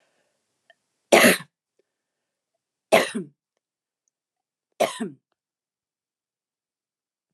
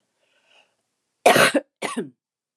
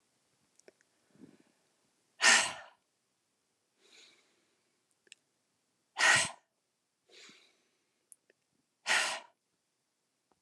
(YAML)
three_cough_length: 7.3 s
three_cough_amplitude: 29204
three_cough_signal_mean_std_ratio: 0.21
cough_length: 2.6 s
cough_amplitude: 28881
cough_signal_mean_std_ratio: 0.32
exhalation_length: 10.4 s
exhalation_amplitude: 10369
exhalation_signal_mean_std_ratio: 0.23
survey_phase: beta (2021-08-13 to 2022-03-07)
age: 45-64
gender: Female
wearing_mask: 'No'
symptom_cough_any: true
symptom_onset: 4 days
smoker_status: Ex-smoker
respiratory_condition_asthma: false
respiratory_condition_other: false
recruitment_source: REACT
submission_delay: 1 day
covid_test_result: Negative
covid_test_method: RT-qPCR